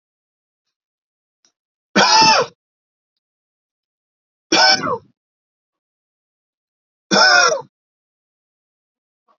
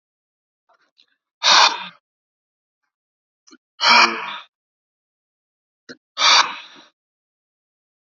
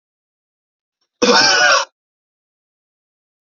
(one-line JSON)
{"three_cough_length": "9.4 s", "three_cough_amplitude": 32256, "three_cough_signal_mean_std_ratio": 0.31, "exhalation_length": "8.0 s", "exhalation_amplitude": 30027, "exhalation_signal_mean_std_ratio": 0.29, "cough_length": "3.4 s", "cough_amplitude": 32768, "cough_signal_mean_std_ratio": 0.36, "survey_phase": "beta (2021-08-13 to 2022-03-07)", "age": "18-44", "gender": "Male", "wearing_mask": "No", "symptom_none": true, "smoker_status": "Never smoked", "respiratory_condition_asthma": false, "respiratory_condition_other": false, "recruitment_source": "REACT", "submission_delay": "1 day", "covid_test_result": "Negative", "covid_test_method": "RT-qPCR", "influenza_a_test_result": "Negative", "influenza_b_test_result": "Negative"}